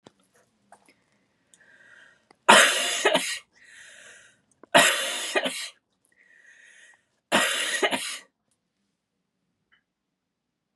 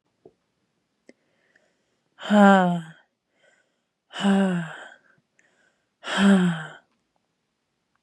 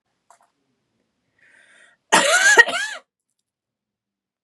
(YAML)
three_cough_length: 10.8 s
three_cough_amplitude: 29235
three_cough_signal_mean_std_ratio: 0.33
exhalation_length: 8.0 s
exhalation_amplitude: 24695
exhalation_signal_mean_std_ratio: 0.34
cough_length: 4.4 s
cough_amplitude: 32768
cough_signal_mean_std_ratio: 0.3
survey_phase: beta (2021-08-13 to 2022-03-07)
age: 18-44
gender: Female
wearing_mask: 'No'
symptom_runny_or_blocked_nose: true
symptom_sore_throat: true
symptom_fatigue: true
symptom_headache: true
symptom_onset: 3 days
smoker_status: Never smoked
respiratory_condition_asthma: false
respiratory_condition_other: false
recruitment_source: REACT
submission_delay: 4 days
covid_test_result: Negative
covid_test_method: RT-qPCR
influenza_a_test_result: Negative
influenza_b_test_result: Negative